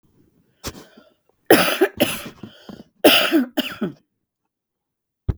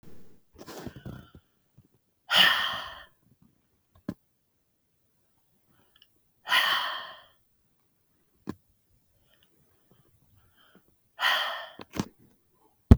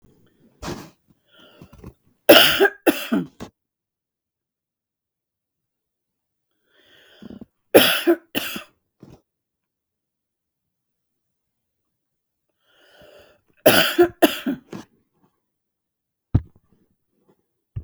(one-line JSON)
{"cough_length": "5.4 s", "cough_amplitude": 32768, "cough_signal_mean_std_ratio": 0.36, "exhalation_length": "13.0 s", "exhalation_amplitude": 32768, "exhalation_signal_mean_std_ratio": 0.25, "three_cough_length": "17.8 s", "three_cough_amplitude": 32768, "three_cough_signal_mean_std_ratio": 0.24, "survey_phase": "beta (2021-08-13 to 2022-03-07)", "age": "65+", "gender": "Female", "wearing_mask": "No", "symptom_none": true, "symptom_onset": "8 days", "smoker_status": "Ex-smoker", "respiratory_condition_asthma": true, "respiratory_condition_other": false, "recruitment_source": "REACT", "submission_delay": "2 days", "covid_test_result": "Negative", "covid_test_method": "RT-qPCR", "influenza_a_test_result": "Unknown/Void", "influenza_b_test_result": "Unknown/Void"}